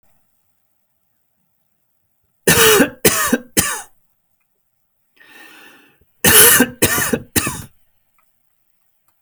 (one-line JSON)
{"cough_length": "9.2 s", "cough_amplitude": 32768, "cough_signal_mean_std_ratio": 0.35, "survey_phase": "beta (2021-08-13 to 2022-03-07)", "age": "45-64", "gender": "Male", "wearing_mask": "No", "symptom_none": true, "smoker_status": "Never smoked", "respiratory_condition_asthma": false, "respiratory_condition_other": false, "recruitment_source": "REACT", "submission_delay": "3 days", "covid_test_result": "Negative", "covid_test_method": "RT-qPCR"}